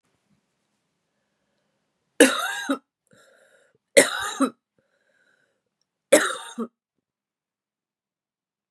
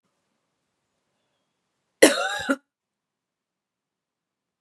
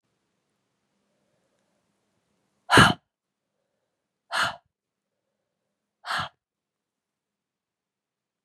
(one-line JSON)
{"three_cough_length": "8.7 s", "three_cough_amplitude": 32767, "three_cough_signal_mean_std_ratio": 0.23, "cough_length": "4.6 s", "cough_amplitude": 32767, "cough_signal_mean_std_ratio": 0.19, "exhalation_length": "8.4 s", "exhalation_amplitude": 26871, "exhalation_signal_mean_std_ratio": 0.17, "survey_phase": "beta (2021-08-13 to 2022-03-07)", "age": "45-64", "gender": "Female", "wearing_mask": "No", "symptom_cough_any": true, "symptom_sore_throat": true, "symptom_fatigue": true, "symptom_headache": true, "symptom_change_to_sense_of_smell_or_taste": true, "smoker_status": "Never smoked", "respiratory_condition_asthma": true, "respiratory_condition_other": false, "recruitment_source": "Test and Trace", "submission_delay": "1 day", "covid_test_result": "Positive", "covid_test_method": "RT-qPCR", "covid_ct_value": 19.5, "covid_ct_gene": "ORF1ab gene", "covid_ct_mean": 19.5, "covid_viral_load": "400000 copies/ml", "covid_viral_load_category": "Low viral load (10K-1M copies/ml)"}